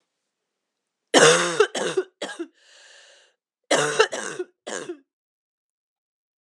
{"cough_length": "6.4 s", "cough_amplitude": 31981, "cough_signal_mean_std_ratio": 0.34, "survey_phase": "alpha (2021-03-01 to 2021-08-12)", "age": "45-64", "gender": "Female", "wearing_mask": "No", "symptom_cough_any": true, "symptom_new_continuous_cough": true, "symptom_fatigue": true, "symptom_headache": true, "symptom_change_to_sense_of_smell_or_taste": true, "smoker_status": "Ex-smoker", "respiratory_condition_asthma": false, "respiratory_condition_other": false, "recruitment_source": "Test and Trace", "submission_delay": "2 days", "covid_test_result": "Positive", "covid_test_method": "LFT"}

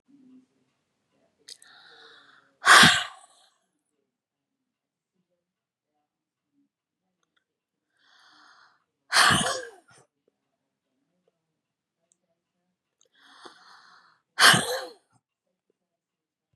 {"exhalation_length": "16.6 s", "exhalation_amplitude": 28490, "exhalation_signal_mean_std_ratio": 0.2, "survey_phase": "beta (2021-08-13 to 2022-03-07)", "age": "45-64", "gender": "Female", "wearing_mask": "No", "symptom_fatigue": true, "symptom_onset": "12 days", "smoker_status": "Never smoked", "respiratory_condition_asthma": false, "respiratory_condition_other": false, "recruitment_source": "REACT", "submission_delay": "2 days", "covid_test_result": "Negative", "covid_test_method": "RT-qPCR", "influenza_a_test_result": "Negative", "influenza_b_test_result": "Negative"}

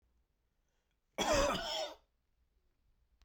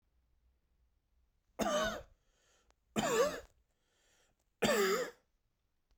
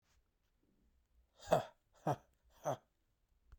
{"cough_length": "3.2 s", "cough_amplitude": 3300, "cough_signal_mean_std_ratio": 0.38, "three_cough_length": "6.0 s", "three_cough_amplitude": 4601, "three_cough_signal_mean_std_ratio": 0.39, "exhalation_length": "3.6 s", "exhalation_amplitude": 5222, "exhalation_signal_mean_std_ratio": 0.24, "survey_phase": "beta (2021-08-13 to 2022-03-07)", "age": "18-44", "gender": "Male", "wearing_mask": "No", "symptom_cough_any": true, "symptom_runny_or_blocked_nose": true, "symptom_sore_throat": true, "symptom_onset": "3 days", "smoker_status": "Never smoked", "respiratory_condition_asthma": false, "respiratory_condition_other": false, "recruitment_source": "Test and Trace", "submission_delay": "2 days", "covid_test_result": "Positive", "covid_test_method": "RT-qPCR", "covid_ct_value": 23.3, "covid_ct_gene": "N gene"}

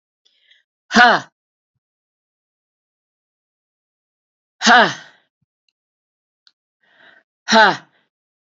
{"exhalation_length": "8.4 s", "exhalation_amplitude": 32768, "exhalation_signal_mean_std_ratio": 0.24, "survey_phase": "alpha (2021-03-01 to 2021-08-12)", "age": "65+", "gender": "Female", "wearing_mask": "No", "symptom_cough_any": true, "symptom_fatigue": true, "symptom_headache": true, "symptom_change_to_sense_of_smell_or_taste": true, "symptom_loss_of_taste": true, "smoker_status": "Never smoked", "respiratory_condition_asthma": false, "respiratory_condition_other": false, "recruitment_source": "Test and Trace", "submission_delay": "2 days", "covid_test_result": "Positive", "covid_test_method": "LFT"}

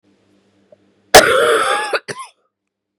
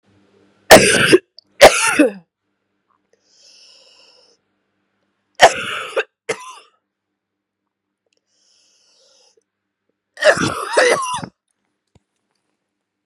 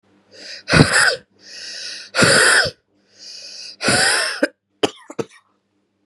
{"cough_length": "3.0 s", "cough_amplitude": 32768, "cough_signal_mean_std_ratio": 0.39, "three_cough_length": "13.1 s", "three_cough_amplitude": 32768, "three_cough_signal_mean_std_ratio": 0.28, "exhalation_length": "6.1 s", "exhalation_amplitude": 32768, "exhalation_signal_mean_std_ratio": 0.46, "survey_phase": "beta (2021-08-13 to 2022-03-07)", "age": "18-44", "gender": "Female", "wearing_mask": "No", "symptom_cough_any": true, "symptom_runny_or_blocked_nose": true, "symptom_sore_throat": true, "symptom_fever_high_temperature": true, "symptom_headache": true, "smoker_status": "Never smoked", "respiratory_condition_asthma": false, "respiratory_condition_other": false, "recruitment_source": "Test and Trace", "submission_delay": "0 days", "covid_test_result": "Positive", "covid_test_method": "LFT"}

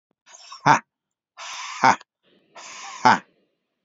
{"exhalation_length": "3.8 s", "exhalation_amplitude": 29105, "exhalation_signal_mean_std_ratio": 0.29, "survey_phase": "beta (2021-08-13 to 2022-03-07)", "age": "18-44", "gender": "Male", "wearing_mask": "No", "symptom_runny_or_blocked_nose": true, "symptom_onset": "13 days", "smoker_status": "Never smoked", "respiratory_condition_asthma": true, "respiratory_condition_other": false, "recruitment_source": "REACT", "submission_delay": "6 days", "covid_test_result": "Negative", "covid_test_method": "RT-qPCR", "influenza_a_test_result": "Negative", "influenza_b_test_result": "Negative"}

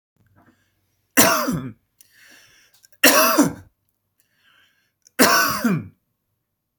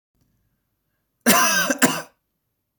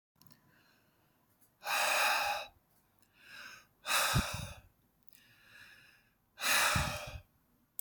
{"three_cough_length": "6.8 s", "three_cough_amplitude": 32768, "three_cough_signal_mean_std_ratio": 0.37, "cough_length": "2.8 s", "cough_amplitude": 32768, "cough_signal_mean_std_ratio": 0.38, "exhalation_length": "7.8 s", "exhalation_amplitude": 4439, "exhalation_signal_mean_std_ratio": 0.45, "survey_phase": "beta (2021-08-13 to 2022-03-07)", "age": "18-44", "gender": "Male", "wearing_mask": "No", "symptom_none": true, "smoker_status": "Never smoked", "respiratory_condition_asthma": false, "respiratory_condition_other": false, "recruitment_source": "REACT", "submission_delay": "14 days", "covid_test_result": "Negative", "covid_test_method": "RT-qPCR"}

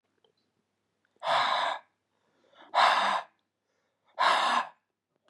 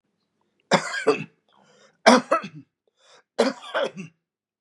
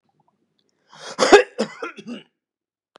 {"exhalation_length": "5.3 s", "exhalation_amplitude": 11384, "exhalation_signal_mean_std_ratio": 0.44, "three_cough_length": "4.6 s", "three_cough_amplitude": 32542, "three_cough_signal_mean_std_ratio": 0.32, "cough_length": "3.0 s", "cough_amplitude": 32768, "cough_signal_mean_std_ratio": 0.25, "survey_phase": "beta (2021-08-13 to 2022-03-07)", "age": "65+", "gender": "Male", "wearing_mask": "No", "symptom_runny_or_blocked_nose": true, "symptom_sore_throat": true, "symptom_fatigue": true, "smoker_status": "Ex-smoker", "respiratory_condition_asthma": false, "respiratory_condition_other": false, "recruitment_source": "Test and Trace", "submission_delay": "1 day", "covid_test_result": "Positive", "covid_test_method": "RT-qPCR", "covid_ct_value": 24.4, "covid_ct_gene": "N gene"}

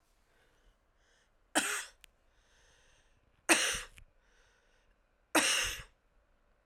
{"three_cough_length": "6.7 s", "three_cough_amplitude": 11219, "three_cough_signal_mean_std_ratio": 0.3, "survey_phase": "beta (2021-08-13 to 2022-03-07)", "age": "45-64", "gender": "Female", "wearing_mask": "No", "symptom_cough_any": true, "symptom_runny_or_blocked_nose": true, "symptom_sore_throat": true, "symptom_diarrhoea": true, "symptom_fatigue": true, "symptom_fever_high_temperature": true, "symptom_headache": true, "symptom_change_to_sense_of_smell_or_taste": true, "symptom_loss_of_taste": true, "symptom_onset": "5 days", "smoker_status": "Never smoked", "respiratory_condition_asthma": false, "respiratory_condition_other": false, "recruitment_source": "Test and Trace", "submission_delay": "4 days", "covid_test_result": "Positive", "covid_test_method": "RT-qPCR", "covid_ct_value": 23.4, "covid_ct_gene": "S gene", "covid_ct_mean": 23.8, "covid_viral_load": "16000 copies/ml", "covid_viral_load_category": "Low viral load (10K-1M copies/ml)"}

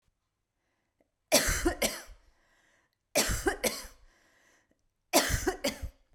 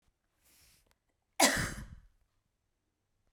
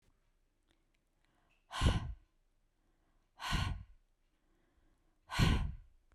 {"three_cough_length": "6.1 s", "three_cough_amplitude": 13900, "three_cough_signal_mean_std_ratio": 0.4, "cough_length": "3.3 s", "cough_amplitude": 11034, "cough_signal_mean_std_ratio": 0.24, "exhalation_length": "6.1 s", "exhalation_amplitude": 5097, "exhalation_signal_mean_std_ratio": 0.33, "survey_phase": "beta (2021-08-13 to 2022-03-07)", "age": "18-44", "gender": "Female", "wearing_mask": "No", "symptom_none": true, "smoker_status": "Never smoked", "respiratory_condition_asthma": false, "respiratory_condition_other": false, "recruitment_source": "REACT", "submission_delay": "2 days", "covid_test_result": "Negative", "covid_test_method": "RT-qPCR", "influenza_a_test_result": "Unknown/Void", "influenza_b_test_result": "Unknown/Void"}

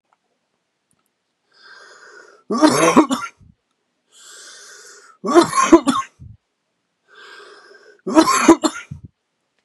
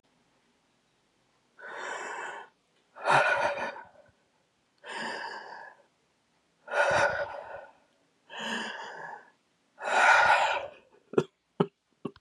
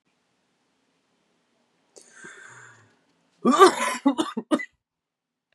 {"three_cough_length": "9.6 s", "three_cough_amplitude": 32768, "three_cough_signal_mean_std_ratio": 0.34, "exhalation_length": "12.2 s", "exhalation_amplitude": 12258, "exhalation_signal_mean_std_ratio": 0.42, "cough_length": "5.5 s", "cough_amplitude": 27304, "cough_signal_mean_std_ratio": 0.27, "survey_phase": "beta (2021-08-13 to 2022-03-07)", "age": "18-44", "gender": "Male", "wearing_mask": "No", "symptom_cough_any": true, "symptom_runny_or_blocked_nose": true, "symptom_shortness_of_breath": true, "symptom_fatigue": true, "symptom_headache": true, "symptom_onset": "6 days", "smoker_status": "Never smoked", "respiratory_condition_asthma": false, "respiratory_condition_other": false, "recruitment_source": "Test and Trace", "submission_delay": "1 day", "covid_test_result": "Positive", "covid_test_method": "RT-qPCR", "covid_ct_value": 18.6, "covid_ct_gene": "ORF1ab gene"}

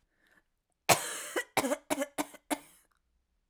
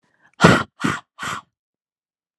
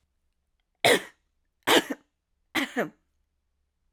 {"cough_length": "3.5 s", "cough_amplitude": 15629, "cough_signal_mean_std_ratio": 0.33, "exhalation_length": "2.4 s", "exhalation_amplitude": 32768, "exhalation_signal_mean_std_ratio": 0.3, "three_cough_length": "3.9 s", "three_cough_amplitude": 16358, "three_cough_signal_mean_std_ratio": 0.28, "survey_phase": "alpha (2021-03-01 to 2021-08-12)", "age": "18-44", "gender": "Female", "wearing_mask": "No", "symptom_cough_any": true, "symptom_change_to_sense_of_smell_or_taste": true, "symptom_onset": "4 days", "smoker_status": "Never smoked", "respiratory_condition_asthma": false, "respiratory_condition_other": false, "recruitment_source": "Test and Trace", "submission_delay": "1 day", "covid_test_result": "Positive", "covid_test_method": "RT-qPCR", "covid_ct_value": 25.2, "covid_ct_gene": "N gene"}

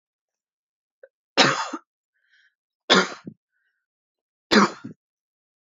{"three_cough_length": "5.6 s", "three_cough_amplitude": 27732, "three_cough_signal_mean_std_ratio": 0.26, "survey_phase": "beta (2021-08-13 to 2022-03-07)", "age": "18-44", "gender": "Female", "wearing_mask": "No", "symptom_cough_any": true, "symptom_runny_or_blocked_nose": true, "symptom_shortness_of_breath": true, "symptom_sore_throat": true, "symptom_abdominal_pain": true, "symptom_diarrhoea": true, "symptom_fatigue": true, "symptom_headache": true, "symptom_change_to_sense_of_smell_or_taste": true, "smoker_status": "Never smoked", "respiratory_condition_asthma": true, "respiratory_condition_other": false, "recruitment_source": "Test and Trace", "submission_delay": "1 day", "covid_test_result": "Positive", "covid_test_method": "RT-qPCR", "covid_ct_value": 29.5, "covid_ct_gene": "ORF1ab gene", "covid_ct_mean": 29.8, "covid_viral_load": "160 copies/ml", "covid_viral_load_category": "Minimal viral load (< 10K copies/ml)"}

